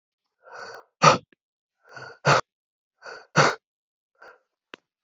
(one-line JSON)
{"exhalation_length": "5.0 s", "exhalation_amplitude": 27606, "exhalation_signal_mean_std_ratio": 0.26, "survey_phase": "beta (2021-08-13 to 2022-03-07)", "age": "18-44", "gender": "Male", "wearing_mask": "Yes", "symptom_cough_any": true, "symptom_runny_or_blocked_nose": true, "symptom_sore_throat": true, "symptom_fever_high_temperature": true, "symptom_headache": true, "smoker_status": "Never smoked", "respiratory_condition_asthma": false, "respiratory_condition_other": false, "recruitment_source": "Test and Trace", "submission_delay": "2 days", "covid_test_result": "Positive", "covid_test_method": "RT-qPCR", "covid_ct_value": 14.1, "covid_ct_gene": "ORF1ab gene", "covid_ct_mean": 14.2, "covid_viral_load": "21000000 copies/ml", "covid_viral_load_category": "High viral load (>1M copies/ml)"}